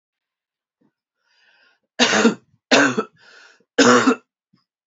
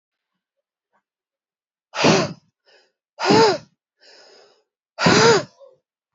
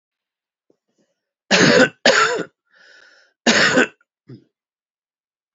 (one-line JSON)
{"three_cough_length": "4.9 s", "three_cough_amplitude": 29961, "three_cough_signal_mean_std_ratio": 0.36, "exhalation_length": "6.1 s", "exhalation_amplitude": 28853, "exhalation_signal_mean_std_ratio": 0.34, "cough_length": "5.5 s", "cough_amplitude": 29253, "cough_signal_mean_std_ratio": 0.37, "survey_phase": "beta (2021-08-13 to 2022-03-07)", "age": "18-44", "gender": "Male", "wearing_mask": "No", "symptom_cough_any": true, "symptom_runny_or_blocked_nose": true, "symptom_fatigue": true, "symptom_headache": true, "symptom_loss_of_taste": true, "symptom_onset": "2 days", "smoker_status": "Never smoked", "respiratory_condition_asthma": false, "respiratory_condition_other": false, "recruitment_source": "Test and Trace", "submission_delay": "2 days", "covid_test_result": "Positive", "covid_test_method": "RT-qPCR", "covid_ct_value": 17.1, "covid_ct_gene": "ORF1ab gene", "covid_ct_mean": 18.4, "covid_viral_load": "910000 copies/ml", "covid_viral_load_category": "Low viral load (10K-1M copies/ml)"}